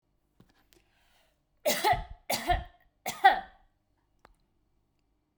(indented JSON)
{
  "three_cough_length": "5.4 s",
  "three_cough_amplitude": 17050,
  "three_cough_signal_mean_std_ratio": 0.29,
  "survey_phase": "beta (2021-08-13 to 2022-03-07)",
  "age": "45-64",
  "gender": "Female",
  "wearing_mask": "No",
  "symptom_change_to_sense_of_smell_or_taste": true,
  "symptom_onset": "12 days",
  "smoker_status": "Never smoked",
  "respiratory_condition_asthma": false,
  "respiratory_condition_other": false,
  "recruitment_source": "REACT",
  "submission_delay": "6 days",
  "covid_test_result": "Negative",
  "covid_test_method": "RT-qPCR",
  "influenza_a_test_result": "Negative",
  "influenza_b_test_result": "Negative"
}